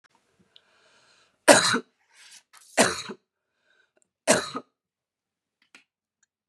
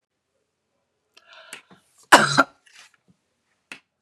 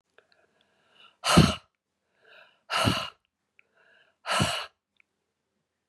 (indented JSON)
{
  "three_cough_length": "6.5 s",
  "three_cough_amplitude": 32023,
  "three_cough_signal_mean_std_ratio": 0.24,
  "cough_length": "4.0 s",
  "cough_amplitude": 32768,
  "cough_signal_mean_std_ratio": 0.19,
  "exhalation_length": "5.9 s",
  "exhalation_amplitude": 18631,
  "exhalation_signal_mean_std_ratio": 0.29,
  "survey_phase": "beta (2021-08-13 to 2022-03-07)",
  "age": "45-64",
  "gender": "Female",
  "wearing_mask": "No",
  "symptom_cough_any": true,
  "symptom_new_continuous_cough": true,
  "symptom_runny_or_blocked_nose": true,
  "symptom_sore_throat": true,
  "symptom_fatigue": true,
  "symptom_fever_high_temperature": true,
  "symptom_headache": true,
  "symptom_change_to_sense_of_smell_or_taste": true,
  "symptom_onset": "3 days",
  "smoker_status": "Never smoked",
  "respiratory_condition_asthma": false,
  "respiratory_condition_other": false,
  "recruitment_source": "Test and Trace",
  "submission_delay": "1 day",
  "covid_test_result": "Positive",
  "covid_test_method": "RT-qPCR",
  "covid_ct_value": 21.9,
  "covid_ct_gene": "ORF1ab gene",
  "covid_ct_mean": 22.0,
  "covid_viral_load": "59000 copies/ml",
  "covid_viral_load_category": "Low viral load (10K-1M copies/ml)"
}